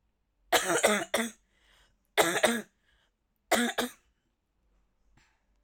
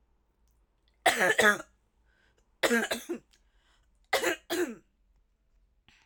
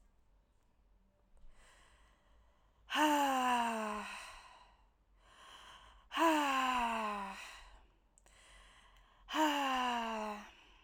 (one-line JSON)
{"three_cough_length": "5.6 s", "three_cough_amplitude": 13288, "three_cough_signal_mean_std_ratio": 0.37, "cough_length": "6.1 s", "cough_amplitude": 12547, "cough_signal_mean_std_ratio": 0.35, "exhalation_length": "10.8 s", "exhalation_amplitude": 3624, "exhalation_signal_mean_std_ratio": 0.52, "survey_phase": "alpha (2021-03-01 to 2021-08-12)", "age": "18-44", "gender": "Female", "wearing_mask": "No", "symptom_fatigue": true, "symptom_onset": "7 days", "smoker_status": "Never smoked", "respiratory_condition_asthma": false, "respiratory_condition_other": false, "recruitment_source": "REACT", "submission_delay": "1 day", "covid_test_result": "Negative", "covid_test_method": "RT-qPCR"}